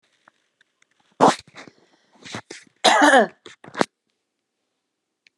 {
  "cough_length": "5.4 s",
  "cough_amplitude": 32511,
  "cough_signal_mean_std_ratio": 0.28,
  "survey_phase": "beta (2021-08-13 to 2022-03-07)",
  "age": "45-64",
  "gender": "Female",
  "wearing_mask": "No",
  "symptom_none": true,
  "smoker_status": "Never smoked",
  "respiratory_condition_asthma": false,
  "respiratory_condition_other": false,
  "recruitment_source": "REACT",
  "submission_delay": "2 days",
  "covid_test_result": "Negative",
  "covid_test_method": "RT-qPCR",
  "influenza_a_test_result": "Negative",
  "influenza_b_test_result": "Negative"
}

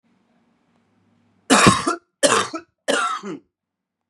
{
  "three_cough_length": "4.1 s",
  "three_cough_amplitude": 32768,
  "three_cough_signal_mean_std_ratio": 0.38,
  "survey_phase": "beta (2021-08-13 to 2022-03-07)",
  "age": "18-44",
  "gender": "Male",
  "wearing_mask": "No",
  "symptom_cough_any": true,
  "symptom_new_continuous_cough": true,
  "symptom_runny_or_blocked_nose": true,
  "symptom_shortness_of_breath": true,
  "symptom_sore_throat": true,
  "symptom_fatigue": true,
  "symptom_headache": true,
  "smoker_status": "Never smoked",
  "respiratory_condition_asthma": false,
  "respiratory_condition_other": false,
  "recruitment_source": "Test and Trace",
  "submission_delay": "1 day",
  "covid_test_result": "Positive",
  "covid_test_method": "RT-qPCR",
  "covid_ct_value": 19.4,
  "covid_ct_gene": "N gene"
}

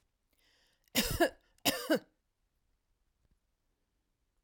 {
  "three_cough_length": "4.4 s",
  "three_cough_amplitude": 6869,
  "three_cough_signal_mean_std_ratio": 0.27,
  "survey_phase": "alpha (2021-03-01 to 2021-08-12)",
  "age": "65+",
  "gender": "Female",
  "wearing_mask": "No",
  "symptom_none": true,
  "smoker_status": "Never smoked",
  "respiratory_condition_asthma": false,
  "respiratory_condition_other": false,
  "recruitment_source": "REACT",
  "submission_delay": "1 day",
  "covid_test_result": "Negative",
  "covid_test_method": "RT-qPCR"
}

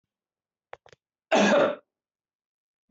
{
  "cough_length": "2.9 s",
  "cough_amplitude": 12677,
  "cough_signal_mean_std_ratio": 0.32,
  "survey_phase": "beta (2021-08-13 to 2022-03-07)",
  "age": "65+",
  "gender": "Male",
  "wearing_mask": "No",
  "symptom_none": true,
  "smoker_status": "Never smoked",
  "respiratory_condition_asthma": false,
  "respiratory_condition_other": false,
  "recruitment_source": "REACT",
  "submission_delay": "3 days",
  "covid_test_result": "Negative",
  "covid_test_method": "RT-qPCR"
}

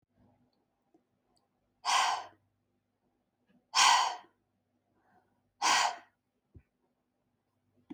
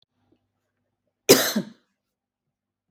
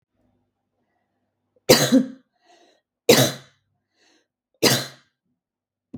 {
  "exhalation_length": "7.9 s",
  "exhalation_amplitude": 8614,
  "exhalation_signal_mean_std_ratio": 0.29,
  "cough_length": "2.9 s",
  "cough_amplitude": 32766,
  "cough_signal_mean_std_ratio": 0.21,
  "three_cough_length": "6.0 s",
  "three_cough_amplitude": 32766,
  "three_cough_signal_mean_std_ratio": 0.27,
  "survey_phase": "beta (2021-08-13 to 2022-03-07)",
  "age": "18-44",
  "gender": "Female",
  "wearing_mask": "No",
  "symptom_none": true,
  "smoker_status": "Never smoked",
  "respiratory_condition_asthma": true,
  "respiratory_condition_other": false,
  "recruitment_source": "REACT",
  "submission_delay": "1 day",
  "covid_test_result": "Negative",
  "covid_test_method": "RT-qPCR",
  "influenza_a_test_result": "Negative",
  "influenza_b_test_result": "Negative"
}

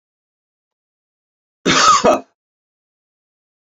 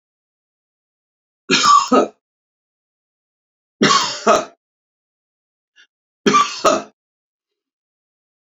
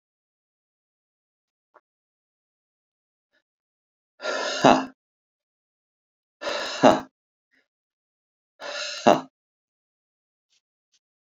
{
  "cough_length": "3.8 s",
  "cough_amplitude": 30658,
  "cough_signal_mean_std_ratio": 0.3,
  "three_cough_length": "8.4 s",
  "three_cough_amplitude": 28832,
  "three_cough_signal_mean_std_ratio": 0.33,
  "exhalation_length": "11.3 s",
  "exhalation_amplitude": 29172,
  "exhalation_signal_mean_std_ratio": 0.21,
  "survey_phase": "beta (2021-08-13 to 2022-03-07)",
  "age": "65+",
  "gender": "Male",
  "wearing_mask": "No",
  "symptom_none": true,
  "smoker_status": "Ex-smoker",
  "respiratory_condition_asthma": false,
  "respiratory_condition_other": false,
  "recruitment_source": "REACT",
  "submission_delay": "10 days",
  "covid_test_result": "Negative",
  "covid_test_method": "RT-qPCR"
}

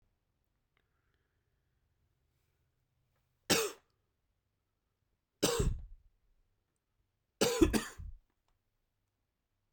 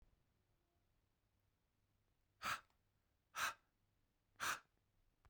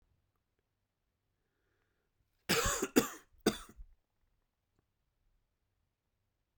{
  "three_cough_length": "9.7 s",
  "three_cough_amplitude": 7457,
  "three_cough_signal_mean_std_ratio": 0.25,
  "exhalation_length": "5.3 s",
  "exhalation_amplitude": 1051,
  "exhalation_signal_mean_std_ratio": 0.27,
  "cough_length": "6.6 s",
  "cough_amplitude": 9177,
  "cough_signal_mean_std_ratio": 0.22,
  "survey_phase": "beta (2021-08-13 to 2022-03-07)",
  "age": "18-44",
  "gender": "Male",
  "wearing_mask": "No",
  "symptom_cough_any": true,
  "symptom_runny_or_blocked_nose": true,
  "symptom_shortness_of_breath": true,
  "symptom_fatigue": true,
  "symptom_headache": true,
  "symptom_other": true,
  "smoker_status": "Ex-smoker",
  "respiratory_condition_asthma": false,
  "respiratory_condition_other": false,
  "recruitment_source": "Test and Trace",
  "submission_delay": "2 days",
  "covid_test_result": "Positive",
  "covid_test_method": "LFT"
}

